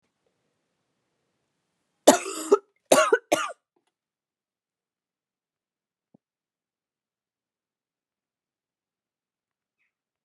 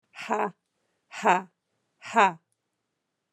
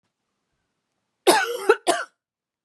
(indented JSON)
{
  "three_cough_length": "10.2 s",
  "three_cough_amplitude": 30242,
  "three_cough_signal_mean_std_ratio": 0.17,
  "exhalation_length": "3.3 s",
  "exhalation_amplitude": 17159,
  "exhalation_signal_mean_std_ratio": 0.3,
  "cough_length": "2.6 s",
  "cough_amplitude": 25653,
  "cough_signal_mean_std_ratio": 0.33,
  "survey_phase": "beta (2021-08-13 to 2022-03-07)",
  "age": "45-64",
  "gender": "Female",
  "wearing_mask": "No",
  "symptom_cough_any": true,
  "symptom_runny_or_blocked_nose": true,
  "symptom_shortness_of_breath": true,
  "symptom_fatigue": true,
  "symptom_fever_high_temperature": true,
  "symptom_headache": true,
  "symptom_change_to_sense_of_smell_or_taste": true,
  "symptom_loss_of_taste": true,
  "symptom_onset": "4 days",
  "smoker_status": "Never smoked",
  "respiratory_condition_asthma": false,
  "respiratory_condition_other": false,
  "recruitment_source": "Test and Trace",
  "submission_delay": "2 days",
  "covid_test_result": "Positive",
  "covid_test_method": "RT-qPCR",
  "covid_ct_value": 22.2,
  "covid_ct_gene": "ORF1ab gene"
}